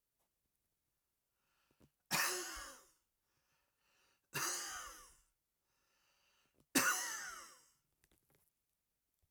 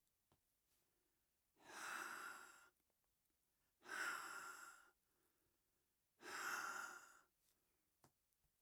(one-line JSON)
{"three_cough_length": "9.3 s", "three_cough_amplitude": 4990, "three_cough_signal_mean_std_ratio": 0.32, "exhalation_length": "8.6 s", "exhalation_amplitude": 557, "exhalation_signal_mean_std_ratio": 0.46, "survey_phase": "alpha (2021-03-01 to 2021-08-12)", "age": "65+", "gender": "Male", "wearing_mask": "No", "symptom_none": true, "smoker_status": "Never smoked", "respiratory_condition_asthma": false, "respiratory_condition_other": false, "recruitment_source": "REACT", "submission_delay": "2 days", "covid_test_result": "Negative", "covid_test_method": "RT-qPCR"}